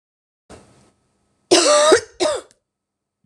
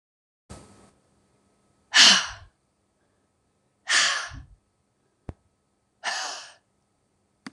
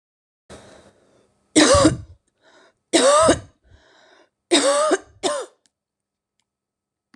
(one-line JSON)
{"cough_length": "3.3 s", "cough_amplitude": 26028, "cough_signal_mean_std_ratio": 0.38, "exhalation_length": "7.5 s", "exhalation_amplitude": 25689, "exhalation_signal_mean_std_ratio": 0.25, "three_cough_length": "7.2 s", "three_cough_amplitude": 25609, "three_cough_signal_mean_std_ratio": 0.38, "survey_phase": "beta (2021-08-13 to 2022-03-07)", "age": "45-64", "gender": "Female", "wearing_mask": "No", "symptom_cough_any": true, "symptom_runny_or_blocked_nose": true, "symptom_shortness_of_breath": true, "symptom_sore_throat": true, "symptom_headache": true, "symptom_onset": "3 days", "smoker_status": "Ex-smoker", "respiratory_condition_asthma": false, "respiratory_condition_other": false, "recruitment_source": "Test and Trace", "submission_delay": "1 day", "covid_test_result": "Positive", "covid_test_method": "RT-qPCR", "covid_ct_value": 20.7, "covid_ct_gene": "ORF1ab gene", "covid_ct_mean": 20.8, "covid_viral_load": "150000 copies/ml", "covid_viral_load_category": "Low viral load (10K-1M copies/ml)"}